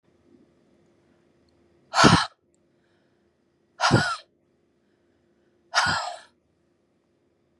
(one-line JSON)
{"exhalation_length": "7.6 s", "exhalation_amplitude": 25115, "exhalation_signal_mean_std_ratio": 0.27, "survey_phase": "beta (2021-08-13 to 2022-03-07)", "age": "45-64", "gender": "Female", "wearing_mask": "No", "symptom_none": true, "smoker_status": "Never smoked", "respiratory_condition_asthma": false, "respiratory_condition_other": false, "recruitment_source": "REACT", "submission_delay": "2 days", "covid_test_result": "Negative", "covid_test_method": "RT-qPCR", "influenza_a_test_result": "Negative", "influenza_b_test_result": "Negative"}